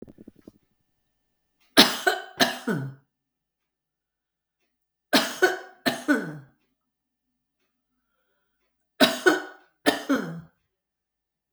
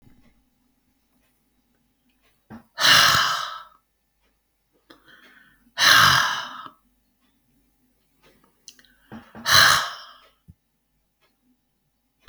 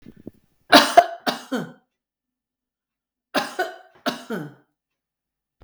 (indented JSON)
{
  "three_cough_length": "11.5 s",
  "three_cough_amplitude": 32768,
  "three_cough_signal_mean_std_ratio": 0.29,
  "exhalation_length": "12.3 s",
  "exhalation_amplitude": 32173,
  "exhalation_signal_mean_std_ratio": 0.3,
  "cough_length": "5.6 s",
  "cough_amplitude": 32768,
  "cough_signal_mean_std_ratio": 0.25,
  "survey_phase": "beta (2021-08-13 to 2022-03-07)",
  "age": "65+",
  "gender": "Female",
  "wearing_mask": "No",
  "symptom_fatigue": true,
  "smoker_status": "Never smoked",
  "respiratory_condition_asthma": false,
  "respiratory_condition_other": false,
  "recruitment_source": "REACT",
  "submission_delay": "3 days",
  "covid_test_result": "Negative",
  "covid_test_method": "RT-qPCR",
  "influenza_a_test_result": "Unknown/Void",
  "influenza_b_test_result": "Unknown/Void"
}